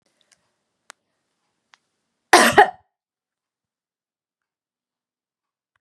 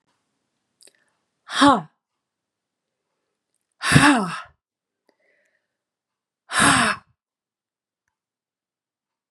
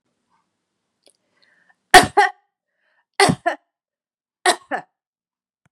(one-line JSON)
{"cough_length": "5.8 s", "cough_amplitude": 32768, "cough_signal_mean_std_ratio": 0.17, "exhalation_length": "9.3 s", "exhalation_amplitude": 32146, "exhalation_signal_mean_std_ratio": 0.27, "three_cough_length": "5.7 s", "three_cough_amplitude": 32768, "three_cough_signal_mean_std_ratio": 0.22, "survey_phase": "beta (2021-08-13 to 2022-03-07)", "age": "65+", "gender": "Female", "wearing_mask": "No", "symptom_none": true, "smoker_status": "Never smoked", "respiratory_condition_asthma": false, "respiratory_condition_other": false, "recruitment_source": "REACT", "submission_delay": "3 days", "covid_test_result": "Negative", "covid_test_method": "RT-qPCR", "influenza_a_test_result": "Negative", "influenza_b_test_result": "Negative"}